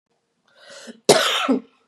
{
  "cough_length": "1.9 s",
  "cough_amplitude": 31721,
  "cough_signal_mean_std_ratio": 0.4,
  "survey_phase": "beta (2021-08-13 to 2022-03-07)",
  "age": "45-64",
  "gender": "Female",
  "wearing_mask": "No",
  "symptom_cough_any": true,
  "symptom_runny_or_blocked_nose": true,
  "symptom_fatigue": true,
  "smoker_status": "Never smoked",
  "respiratory_condition_asthma": false,
  "respiratory_condition_other": false,
  "recruitment_source": "Test and Trace",
  "submission_delay": "2 days",
  "covid_test_result": "Positive",
  "covid_test_method": "RT-qPCR",
  "covid_ct_value": 25.0,
  "covid_ct_gene": "ORF1ab gene"
}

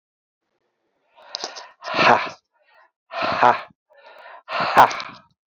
{
  "exhalation_length": "5.5 s",
  "exhalation_amplitude": 30333,
  "exhalation_signal_mean_std_ratio": 0.35,
  "survey_phase": "beta (2021-08-13 to 2022-03-07)",
  "age": "45-64",
  "gender": "Male",
  "wearing_mask": "No",
  "symptom_cough_any": true,
  "symptom_runny_or_blocked_nose": true,
  "symptom_sore_throat": true,
  "symptom_fatigue": true,
  "symptom_onset": "11 days",
  "smoker_status": "Ex-smoker",
  "respiratory_condition_asthma": false,
  "respiratory_condition_other": false,
  "recruitment_source": "REACT",
  "submission_delay": "1 day",
  "covid_test_result": "Negative",
  "covid_test_method": "RT-qPCR"
}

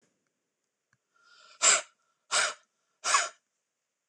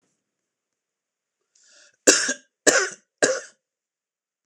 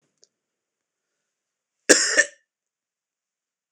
{
  "exhalation_length": "4.1 s",
  "exhalation_amplitude": 13109,
  "exhalation_signal_mean_std_ratio": 0.3,
  "three_cough_length": "4.5 s",
  "three_cough_amplitude": 26028,
  "three_cough_signal_mean_std_ratio": 0.27,
  "cough_length": "3.7 s",
  "cough_amplitude": 26028,
  "cough_signal_mean_std_ratio": 0.21,
  "survey_phase": "beta (2021-08-13 to 2022-03-07)",
  "age": "45-64",
  "gender": "Male",
  "wearing_mask": "No",
  "symptom_cough_any": true,
  "symptom_runny_or_blocked_nose": true,
  "symptom_sore_throat": true,
  "symptom_headache": true,
  "symptom_onset": "3 days",
  "smoker_status": "Never smoked",
  "respiratory_condition_asthma": false,
  "respiratory_condition_other": false,
  "recruitment_source": "REACT",
  "submission_delay": "2 days",
  "covid_test_result": "Negative",
  "covid_test_method": "RT-qPCR",
  "influenza_a_test_result": "Unknown/Void",
  "influenza_b_test_result": "Unknown/Void"
}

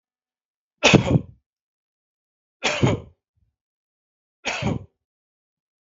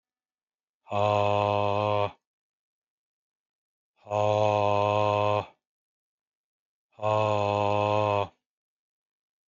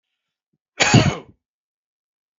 {
  "three_cough_length": "5.8 s",
  "three_cough_amplitude": 32768,
  "three_cough_signal_mean_std_ratio": 0.28,
  "exhalation_length": "9.5 s",
  "exhalation_amplitude": 9593,
  "exhalation_signal_mean_std_ratio": 0.46,
  "cough_length": "2.4 s",
  "cough_amplitude": 32053,
  "cough_signal_mean_std_ratio": 0.28,
  "survey_phase": "beta (2021-08-13 to 2022-03-07)",
  "age": "45-64",
  "gender": "Male",
  "wearing_mask": "No",
  "symptom_none": true,
  "smoker_status": "Ex-smoker",
  "respiratory_condition_asthma": false,
  "respiratory_condition_other": false,
  "recruitment_source": "REACT",
  "submission_delay": "1 day",
  "covid_test_result": "Negative",
  "covid_test_method": "RT-qPCR"
}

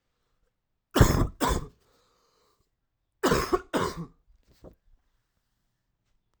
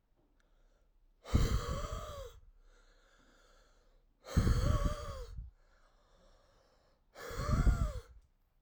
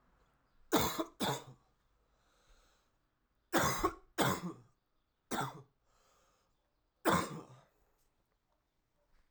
{
  "cough_length": "6.4 s",
  "cough_amplitude": 19823,
  "cough_signal_mean_std_ratio": 0.3,
  "exhalation_length": "8.6 s",
  "exhalation_amplitude": 5714,
  "exhalation_signal_mean_std_ratio": 0.42,
  "three_cough_length": "9.3 s",
  "three_cough_amplitude": 5775,
  "three_cough_signal_mean_std_ratio": 0.34,
  "survey_phase": "alpha (2021-03-01 to 2021-08-12)",
  "age": "18-44",
  "gender": "Male",
  "wearing_mask": "No",
  "symptom_fatigue": true,
  "smoker_status": "Never smoked",
  "respiratory_condition_asthma": false,
  "respiratory_condition_other": false,
  "recruitment_source": "Test and Trace",
  "submission_delay": "2 days",
  "covid_test_result": "Positive",
  "covid_test_method": "RT-qPCR",
  "covid_ct_value": 38.9,
  "covid_ct_gene": "N gene"
}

